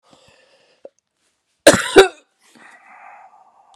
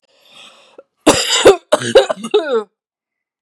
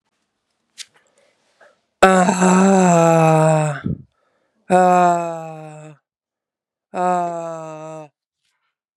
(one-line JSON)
{"cough_length": "3.8 s", "cough_amplitude": 32768, "cough_signal_mean_std_ratio": 0.22, "three_cough_length": "3.4 s", "three_cough_amplitude": 32768, "three_cough_signal_mean_std_ratio": 0.42, "exhalation_length": "9.0 s", "exhalation_amplitude": 32768, "exhalation_signal_mean_std_ratio": 0.47, "survey_phase": "beta (2021-08-13 to 2022-03-07)", "age": "18-44", "gender": "Female", "wearing_mask": "No", "symptom_runny_or_blocked_nose": true, "symptom_shortness_of_breath": true, "symptom_sore_throat": true, "symptom_fatigue": true, "symptom_headache": true, "symptom_change_to_sense_of_smell_or_taste": true, "symptom_other": true, "symptom_onset": "8 days", "smoker_status": "Ex-smoker", "respiratory_condition_asthma": true, "respiratory_condition_other": false, "recruitment_source": "Test and Trace", "submission_delay": "2 days", "covid_test_result": "Positive", "covid_test_method": "RT-qPCR", "covid_ct_value": 29.8, "covid_ct_gene": "N gene"}